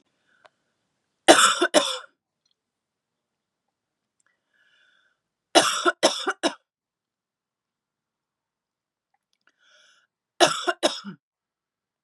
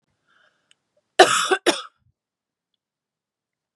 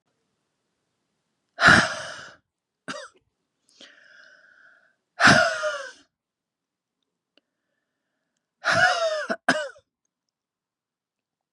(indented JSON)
{
  "three_cough_length": "12.0 s",
  "three_cough_amplitude": 32767,
  "three_cough_signal_mean_std_ratio": 0.25,
  "cough_length": "3.8 s",
  "cough_amplitude": 32767,
  "cough_signal_mean_std_ratio": 0.23,
  "exhalation_length": "11.5 s",
  "exhalation_amplitude": 28217,
  "exhalation_signal_mean_std_ratio": 0.29,
  "survey_phase": "beta (2021-08-13 to 2022-03-07)",
  "age": "18-44",
  "gender": "Female",
  "wearing_mask": "No",
  "symptom_runny_or_blocked_nose": true,
  "symptom_sore_throat": true,
  "symptom_headache": true,
  "symptom_onset": "3 days",
  "smoker_status": "Ex-smoker",
  "respiratory_condition_asthma": false,
  "respiratory_condition_other": false,
  "recruitment_source": "Test and Trace",
  "submission_delay": "1 day",
  "covid_test_result": "Positive",
  "covid_test_method": "RT-qPCR",
  "covid_ct_value": 27.8,
  "covid_ct_gene": "ORF1ab gene",
  "covid_ct_mean": 28.1,
  "covid_viral_load": "590 copies/ml",
  "covid_viral_load_category": "Minimal viral load (< 10K copies/ml)"
}